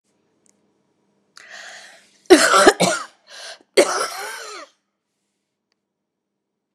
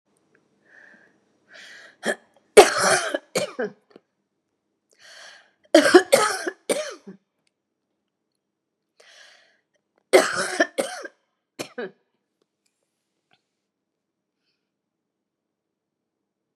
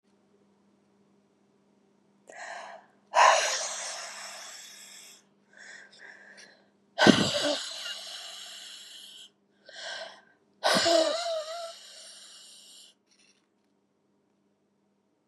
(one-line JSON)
{"cough_length": "6.7 s", "cough_amplitude": 32768, "cough_signal_mean_std_ratio": 0.29, "three_cough_length": "16.6 s", "three_cough_amplitude": 32768, "three_cough_signal_mean_std_ratio": 0.24, "exhalation_length": "15.3 s", "exhalation_amplitude": 27506, "exhalation_signal_mean_std_ratio": 0.35, "survey_phase": "beta (2021-08-13 to 2022-03-07)", "age": "65+", "gender": "Female", "wearing_mask": "No", "symptom_cough_any": true, "symptom_runny_or_blocked_nose": true, "symptom_headache": true, "smoker_status": "Never smoked", "respiratory_condition_asthma": false, "respiratory_condition_other": false, "recruitment_source": "Test and Trace", "submission_delay": "2 days", "covid_test_result": "Positive", "covid_test_method": "RT-qPCR", "covid_ct_value": 28.3, "covid_ct_gene": "N gene"}